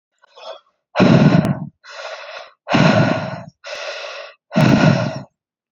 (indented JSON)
{
  "exhalation_length": "5.7 s",
  "exhalation_amplitude": 30043,
  "exhalation_signal_mean_std_ratio": 0.52,
  "survey_phase": "beta (2021-08-13 to 2022-03-07)",
  "age": "18-44",
  "gender": "Female",
  "wearing_mask": "No",
  "symptom_cough_any": true,
  "symptom_runny_or_blocked_nose": true,
  "symptom_sore_throat": true,
  "symptom_fatigue": true,
  "symptom_change_to_sense_of_smell_or_taste": true,
  "symptom_onset": "7 days",
  "smoker_status": "Never smoked",
  "respiratory_condition_asthma": true,
  "respiratory_condition_other": false,
  "recruitment_source": "Test and Trace",
  "submission_delay": "3 days",
  "covid_test_result": "Positive",
  "covid_test_method": "RT-qPCR"
}